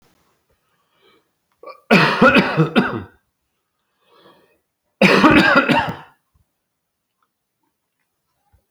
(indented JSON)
{
  "cough_length": "8.7 s",
  "cough_amplitude": 30390,
  "cough_signal_mean_std_ratio": 0.37,
  "survey_phase": "alpha (2021-03-01 to 2021-08-12)",
  "age": "65+",
  "gender": "Male",
  "wearing_mask": "No",
  "symptom_none": true,
  "smoker_status": "Never smoked",
  "respiratory_condition_asthma": false,
  "respiratory_condition_other": false,
  "recruitment_source": "REACT",
  "submission_delay": "3 days",
  "covid_test_result": "Negative",
  "covid_test_method": "RT-qPCR"
}